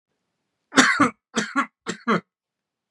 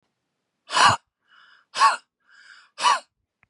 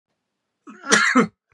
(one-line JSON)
{"three_cough_length": "2.9 s", "three_cough_amplitude": 32204, "three_cough_signal_mean_std_ratio": 0.37, "exhalation_length": "3.5 s", "exhalation_amplitude": 23078, "exhalation_signal_mean_std_ratio": 0.33, "cough_length": "1.5 s", "cough_amplitude": 31792, "cough_signal_mean_std_ratio": 0.4, "survey_phase": "beta (2021-08-13 to 2022-03-07)", "age": "18-44", "gender": "Male", "wearing_mask": "No", "symptom_none": true, "smoker_status": "Never smoked", "respiratory_condition_asthma": false, "respiratory_condition_other": true, "recruitment_source": "REACT", "submission_delay": "1 day", "covid_test_result": "Negative", "covid_test_method": "RT-qPCR", "influenza_a_test_result": "Negative", "influenza_b_test_result": "Negative"}